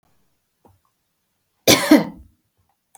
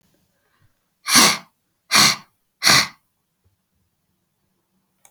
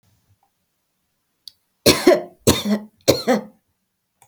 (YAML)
cough_length: 3.0 s
cough_amplitude: 32768
cough_signal_mean_std_ratio: 0.25
exhalation_length: 5.1 s
exhalation_amplitude: 32768
exhalation_signal_mean_std_ratio: 0.3
three_cough_length: 4.3 s
three_cough_amplitude: 32768
three_cough_signal_mean_std_ratio: 0.33
survey_phase: beta (2021-08-13 to 2022-03-07)
age: 45-64
gender: Female
wearing_mask: 'No'
symptom_none: true
smoker_status: Never smoked
respiratory_condition_asthma: false
respiratory_condition_other: false
recruitment_source: REACT
submission_delay: 0 days
covid_test_result: Negative
covid_test_method: RT-qPCR
influenza_a_test_result: Negative
influenza_b_test_result: Negative